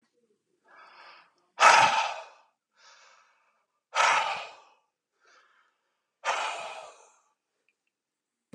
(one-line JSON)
{"exhalation_length": "8.5 s", "exhalation_amplitude": 22377, "exhalation_signal_mean_std_ratio": 0.29, "survey_phase": "beta (2021-08-13 to 2022-03-07)", "age": "45-64", "gender": "Male", "wearing_mask": "No", "symptom_cough_any": true, "smoker_status": "Current smoker (e-cigarettes or vapes only)", "respiratory_condition_asthma": false, "respiratory_condition_other": false, "recruitment_source": "REACT", "submission_delay": "1 day", "covid_test_result": "Negative", "covid_test_method": "RT-qPCR", "influenza_a_test_result": "Negative", "influenza_b_test_result": "Negative"}